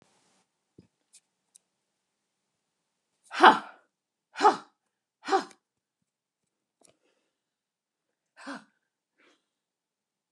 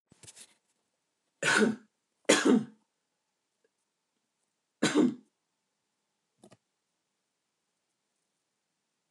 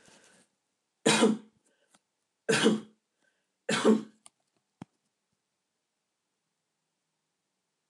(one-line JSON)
{"exhalation_length": "10.3 s", "exhalation_amplitude": 28232, "exhalation_signal_mean_std_ratio": 0.15, "cough_length": "9.1 s", "cough_amplitude": 14186, "cough_signal_mean_std_ratio": 0.25, "three_cough_length": "7.9 s", "three_cough_amplitude": 11124, "three_cough_signal_mean_std_ratio": 0.27, "survey_phase": "alpha (2021-03-01 to 2021-08-12)", "age": "65+", "gender": "Female", "wearing_mask": "No", "symptom_none": true, "smoker_status": "Never smoked", "respiratory_condition_asthma": false, "respiratory_condition_other": false, "recruitment_source": "REACT", "submission_delay": "1 day", "covid_test_result": "Negative", "covid_test_method": "RT-qPCR"}